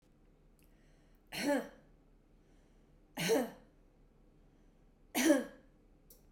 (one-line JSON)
{"three_cough_length": "6.3 s", "three_cough_amplitude": 5378, "three_cough_signal_mean_std_ratio": 0.33, "survey_phase": "beta (2021-08-13 to 2022-03-07)", "age": "45-64", "gender": "Female", "wearing_mask": "No", "symptom_none": true, "smoker_status": "Ex-smoker", "respiratory_condition_asthma": false, "respiratory_condition_other": false, "recruitment_source": "REACT", "submission_delay": "1 day", "covid_test_result": "Negative", "covid_test_method": "RT-qPCR", "influenza_a_test_result": "Negative", "influenza_b_test_result": "Negative"}